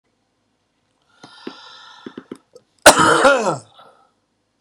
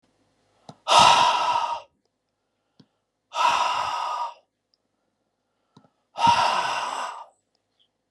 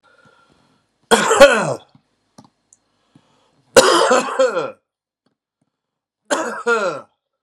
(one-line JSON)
{"cough_length": "4.6 s", "cough_amplitude": 32768, "cough_signal_mean_std_ratio": 0.3, "exhalation_length": "8.1 s", "exhalation_amplitude": 27124, "exhalation_signal_mean_std_ratio": 0.44, "three_cough_length": "7.4 s", "three_cough_amplitude": 32768, "three_cough_signal_mean_std_ratio": 0.37, "survey_phase": "beta (2021-08-13 to 2022-03-07)", "age": "45-64", "gender": "Male", "wearing_mask": "No", "symptom_none": true, "smoker_status": "Ex-smoker", "respiratory_condition_asthma": false, "respiratory_condition_other": false, "recruitment_source": "Test and Trace", "submission_delay": "0 days", "covid_test_result": "Positive", "covid_test_method": "RT-qPCR", "covid_ct_value": 21.7, "covid_ct_gene": "N gene", "covid_ct_mean": 22.2, "covid_viral_load": "51000 copies/ml", "covid_viral_load_category": "Low viral load (10K-1M copies/ml)"}